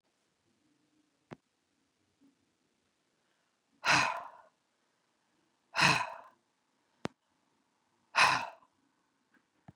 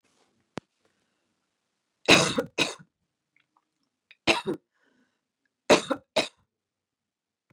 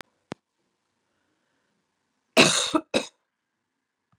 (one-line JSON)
{"exhalation_length": "9.8 s", "exhalation_amplitude": 8626, "exhalation_signal_mean_std_ratio": 0.24, "three_cough_length": "7.5 s", "three_cough_amplitude": 23403, "three_cough_signal_mean_std_ratio": 0.24, "cough_length": "4.2 s", "cough_amplitude": 25755, "cough_signal_mean_std_ratio": 0.24, "survey_phase": "beta (2021-08-13 to 2022-03-07)", "age": "45-64", "gender": "Female", "wearing_mask": "No", "symptom_none": true, "smoker_status": "Ex-smoker", "respiratory_condition_asthma": true, "respiratory_condition_other": false, "recruitment_source": "REACT", "submission_delay": "1 day", "covid_test_result": "Negative", "covid_test_method": "RT-qPCR", "influenza_a_test_result": "Negative", "influenza_b_test_result": "Negative"}